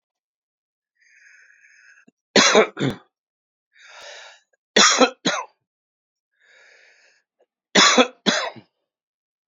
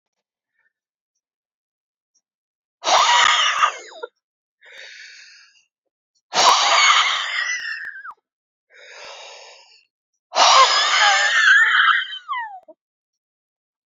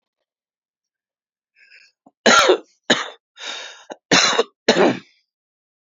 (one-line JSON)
{"three_cough_length": "9.5 s", "three_cough_amplitude": 32374, "three_cough_signal_mean_std_ratio": 0.3, "exhalation_length": "13.9 s", "exhalation_amplitude": 29340, "exhalation_signal_mean_std_ratio": 0.46, "cough_length": "5.8 s", "cough_amplitude": 32014, "cough_signal_mean_std_ratio": 0.35, "survey_phase": "beta (2021-08-13 to 2022-03-07)", "age": "45-64", "gender": "Male", "wearing_mask": "No", "symptom_cough_any": true, "symptom_abdominal_pain": true, "symptom_fatigue": true, "smoker_status": "Never smoked", "respiratory_condition_asthma": false, "respiratory_condition_other": false, "recruitment_source": "Test and Trace", "submission_delay": "1 day", "covid_test_result": "Positive", "covid_test_method": "LFT"}